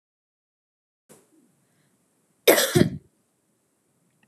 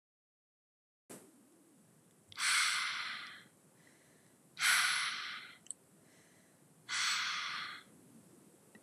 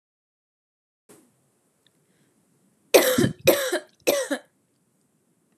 cough_length: 4.3 s
cough_amplitude: 30427
cough_signal_mean_std_ratio: 0.22
exhalation_length: 8.8 s
exhalation_amplitude: 4691
exhalation_signal_mean_std_ratio: 0.45
three_cough_length: 5.6 s
three_cough_amplitude: 31847
three_cough_signal_mean_std_ratio: 0.3
survey_phase: beta (2021-08-13 to 2022-03-07)
age: 18-44
gender: Female
wearing_mask: 'No'
symptom_cough_any: true
symptom_runny_or_blocked_nose: true
symptom_sore_throat: true
symptom_fatigue: true
symptom_headache: true
symptom_onset: 4 days
smoker_status: Never smoked
respiratory_condition_asthma: false
respiratory_condition_other: false
recruitment_source: Test and Trace
submission_delay: 1 day
covid_test_result: Negative
covid_test_method: RT-qPCR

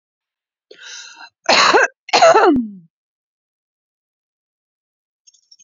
cough_length: 5.6 s
cough_amplitude: 32404
cough_signal_mean_std_ratio: 0.34
survey_phase: beta (2021-08-13 to 2022-03-07)
age: 18-44
gender: Female
wearing_mask: 'No'
symptom_prefer_not_to_say: true
symptom_onset: 9 days
smoker_status: Current smoker (1 to 10 cigarettes per day)
respiratory_condition_asthma: false
respiratory_condition_other: false
recruitment_source: Test and Trace
submission_delay: 2 days
covid_test_result: Positive
covid_test_method: RT-qPCR
covid_ct_value: 28.6
covid_ct_gene: ORF1ab gene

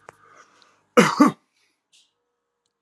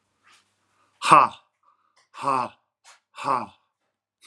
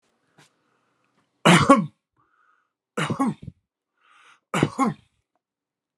cough_length: 2.8 s
cough_amplitude: 32198
cough_signal_mean_std_ratio: 0.25
exhalation_length: 4.3 s
exhalation_amplitude: 31253
exhalation_signal_mean_std_ratio: 0.26
three_cough_length: 6.0 s
three_cough_amplitude: 32631
three_cough_signal_mean_std_ratio: 0.29
survey_phase: alpha (2021-03-01 to 2021-08-12)
age: 45-64
gender: Male
wearing_mask: 'No'
symptom_none: true
smoker_status: Current smoker (11 or more cigarettes per day)
respiratory_condition_asthma: false
respiratory_condition_other: false
recruitment_source: REACT
submission_delay: 1 day
covid_test_result: Negative
covid_test_method: RT-qPCR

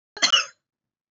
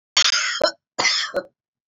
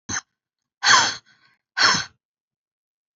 cough_length: 1.1 s
cough_amplitude: 19179
cough_signal_mean_std_ratio: 0.33
three_cough_length: 1.9 s
three_cough_amplitude: 25902
three_cough_signal_mean_std_ratio: 0.56
exhalation_length: 3.2 s
exhalation_amplitude: 25516
exhalation_signal_mean_std_ratio: 0.34
survey_phase: beta (2021-08-13 to 2022-03-07)
age: 45-64
gender: Female
wearing_mask: 'No'
symptom_cough_any: true
symptom_runny_or_blocked_nose: true
symptom_fatigue: true
symptom_headache: true
symptom_change_to_sense_of_smell_or_taste: true
symptom_loss_of_taste: true
symptom_onset: 12 days
smoker_status: Ex-smoker
respiratory_condition_asthma: false
respiratory_condition_other: false
recruitment_source: REACT
submission_delay: 1 day
covid_test_result: Negative
covid_test_method: RT-qPCR
influenza_a_test_result: Negative
influenza_b_test_result: Negative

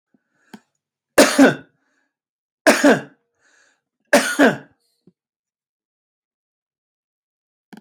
three_cough_length: 7.8 s
three_cough_amplitude: 32768
three_cough_signal_mean_std_ratio: 0.27
survey_phase: beta (2021-08-13 to 2022-03-07)
age: 65+
gender: Male
wearing_mask: 'No'
symptom_none: true
smoker_status: Ex-smoker
respiratory_condition_asthma: false
respiratory_condition_other: false
recruitment_source: REACT
submission_delay: 2 days
covid_test_result: Negative
covid_test_method: RT-qPCR
influenza_a_test_result: Negative
influenza_b_test_result: Negative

